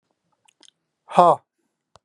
{"exhalation_length": "2.0 s", "exhalation_amplitude": 30783, "exhalation_signal_mean_std_ratio": 0.23, "survey_phase": "beta (2021-08-13 to 2022-03-07)", "age": "45-64", "gender": "Male", "wearing_mask": "No", "symptom_none": true, "smoker_status": "Ex-smoker", "respiratory_condition_asthma": false, "respiratory_condition_other": false, "recruitment_source": "REACT", "submission_delay": "1 day", "covid_test_result": "Negative", "covid_test_method": "RT-qPCR", "influenza_a_test_result": "Negative", "influenza_b_test_result": "Negative"}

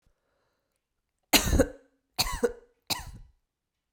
{"three_cough_length": "3.9 s", "three_cough_amplitude": 17681, "three_cough_signal_mean_std_ratio": 0.31, "survey_phase": "beta (2021-08-13 to 2022-03-07)", "age": "18-44", "gender": "Female", "wearing_mask": "No", "symptom_runny_or_blocked_nose": true, "smoker_status": "Never smoked", "respiratory_condition_asthma": false, "respiratory_condition_other": false, "recruitment_source": "REACT", "submission_delay": "5 days", "covid_test_result": "Negative", "covid_test_method": "RT-qPCR"}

